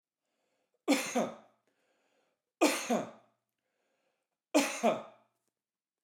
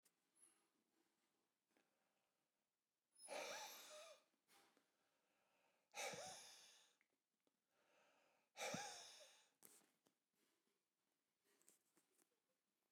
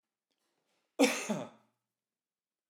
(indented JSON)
{
  "three_cough_length": "6.0 s",
  "three_cough_amplitude": 6690,
  "three_cough_signal_mean_std_ratio": 0.33,
  "exhalation_length": "12.9 s",
  "exhalation_amplitude": 503,
  "exhalation_signal_mean_std_ratio": 0.35,
  "cough_length": "2.7 s",
  "cough_amplitude": 6926,
  "cough_signal_mean_std_ratio": 0.26,
  "survey_phase": "alpha (2021-03-01 to 2021-08-12)",
  "age": "45-64",
  "gender": "Male",
  "wearing_mask": "No",
  "symptom_none": true,
  "smoker_status": "Never smoked",
  "respiratory_condition_asthma": false,
  "respiratory_condition_other": false,
  "recruitment_source": "REACT",
  "submission_delay": "1 day",
  "covid_test_result": "Negative",
  "covid_test_method": "RT-qPCR"
}